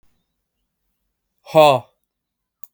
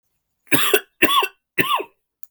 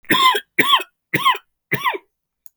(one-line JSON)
{"exhalation_length": "2.7 s", "exhalation_amplitude": 32768, "exhalation_signal_mean_std_ratio": 0.24, "three_cough_length": "2.3 s", "three_cough_amplitude": 32768, "three_cough_signal_mean_std_ratio": 0.45, "cough_length": "2.6 s", "cough_amplitude": 32768, "cough_signal_mean_std_ratio": 0.5, "survey_phase": "beta (2021-08-13 to 2022-03-07)", "age": "18-44", "gender": "Male", "wearing_mask": "No", "symptom_cough_any": true, "symptom_new_continuous_cough": true, "symptom_runny_or_blocked_nose": true, "symptom_sore_throat": true, "symptom_fatigue": true, "symptom_headache": true, "smoker_status": "Never smoked", "respiratory_condition_asthma": true, "respiratory_condition_other": false, "recruitment_source": "Test and Trace", "submission_delay": "1 day", "covid_test_result": "Positive", "covid_test_method": "RT-qPCR", "covid_ct_value": 19.4, "covid_ct_gene": "ORF1ab gene", "covid_ct_mean": 19.5, "covid_viral_load": "400000 copies/ml", "covid_viral_load_category": "Low viral load (10K-1M copies/ml)"}